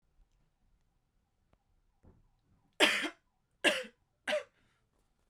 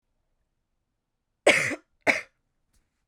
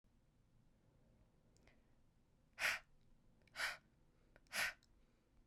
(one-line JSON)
{"three_cough_length": "5.3 s", "three_cough_amplitude": 10563, "three_cough_signal_mean_std_ratio": 0.26, "cough_length": "3.1 s", "cough_amplitude": 20594, "cough_signal_mean_std_ratio": 0.25, "exhalation_length": "5.5 s", "exhalation_amplitude": 1767, "exhalation_signal_mean_std_ratio": 0.31, "survey_phase": "beta (2021-08-13 to 2022-03-07)", "age": "18-44", "gender": "Female", "wearing_mask": "No", "symptom_cough_any": true, "symptom_runny_or_blocked_nose": true, "symptom_shortness_of_breath": true, "symptom_sore_throat": true, "symptom_fatigue": true, "symptom_fever_high_temperature": true, "symptom_headache": true, "symptom_onset": "4 days", "smoker_status": "Never smoked", "respiratory_condition_asthma": false, "respiratory_condition_other": false, "recruitment_source": "Test and Trace", "submission_delay": "1 day", "covid_test_result": "Positive", "covid_test_method": "RT-qPCR"}